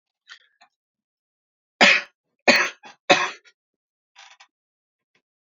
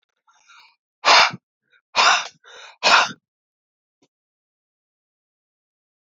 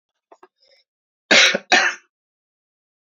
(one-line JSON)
{"three_cough_length": "5.5 s", "three_cough_amplitude": 32767, "three_cough_signal_mean_std_ratio": 0.24, "exhalation_length": "6.1 s", "exhalation_amplitude": 28193, "exhalation_signal_mean_std_ratio": 0.28, "cough_length": "3.1 s", "cough_amplitude": 32406, "cough_signal_mean_std_ratio": 0.31, "survey_phase": "alpha (2021-03-01 to 2021-08-12)", "age": "18-44", "gender": "Male", "wearing_mask": "No", "symptom_fatigue": true, "symptom_headache": true, "symptom_change_to_sense_of_smell_or_taste": true, "symptom_onset": "3 days", "smoker_status": "Never smoked", "respiratory_condition_asthma": false, "respiratory_condition_other": false, "recruitment_source": "Test and Trace", "submission_delay": "2 days", "covid_test_result": "Positive", "covid_test_method": "RT-qPCR"}